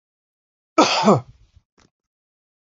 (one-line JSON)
{"cough_length": "2.6 s", "cough_amplitude": 27915, "cough_signal_mean_std_ratio": 0.3, "survey_phase": "beta (2021-08-13 to 2022-03-07)", "age": "45-64", "gender": "Male", "wearing_mask": "No", "symptom_none": true, "smoker_status": "Never smoked", "respiratory_condition_asthma": false, "respiratory_condition_other": false, "recruitment_source": "REACT", "submission_delay": "2 days", "covid_test_result": "Negative", "covid_test_method": "RT-qPCR"}